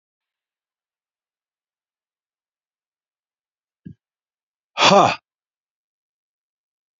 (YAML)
exhalation_length: 7.0 s
exhalation_amplitude: 30233
exhalation_signal_mean_std_ratio: 0.17
survey_phase: beta (2021-08-13 to 2022-03-07)
age: 65+
gender: Male
wearing_mask: 'No'
symptom_none: true
symptom_onset: 12 days
smoker_status: Never smoked
respiratory_condition_asthma: false
respiratory_condition_other: true
recruitment_source: REACT
submission_delay: 4 days
covid_test_result: Negative
covid_test_method: RT-qPCR
influenza_a_test_result: Negative
influenza_b_test_result: Negative